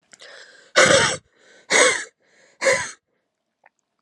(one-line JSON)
{"exhalation_length": "4.0 s", "exhalation_amplitude": 30434, "exhalation_signal_mean_std_ratio": 0.39, "survey_phase": "alpha (2021-03-01 to 2021-08-12)", "age": "18-44", "gender": "Female", "wearing_mask": "No", "symptom_cough_any": true, "symptom_shortness_of_breath": true, "symptom_abdominal_pain": true, "symptom_fatigue": true, "symptom_fever_high_temperature": true, "symptom_headache": true, "symptom_change_to_sense_of_smell_or_taste": true, "symptom_loss_of_taste": true, "symptom_onset": "2 days", "smoker_status": "Current smoker (1 to 10 cigarettes per day)", "respiratory_condition_asthma": false, "respiratory_condition_other": false, "recruitment_source": "Test and Trace", "submission_delay": "1 day", "covid_test_result": "Positive", "covid_test_method": "RT-qPCR"}